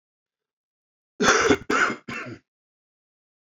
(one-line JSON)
{"cough_length": "3.6 s", "cough_amplitude": 22245, "cough_signal_mean_std_ratio": 0.36, "survey_phase": "alpha (2021-03-01 to 2021-08-12)", "age": "18-44", "gender": "Male", "wearing_mask": "No", "symptom_cough_any": true, "symptom_shortness_of_breath": true, "symptom_fatigue": true, "symptom_change_to_sense_of_smell_or_taste": true, "symptom_loss_of_taste": true, "symptom_onset": "5 days", "smoker_status": "Ex-smoker", "respiratory_condition_asthma": false, "respiratory_condition_other": false, "recruitment_source": "Test and Trace", "submission_delay": "2 days", "covid_test_result": "Positive", "covid_test_method": "RT-qPCR", "covid_ct_value": 16.0, "covid_ct_gene": "N gene", "covid_ct_mean": 16.1, "covid_viral_load": "5300000 copies/ml", "covid_viral_load_category": "High viral load (>1M copies/ml)"}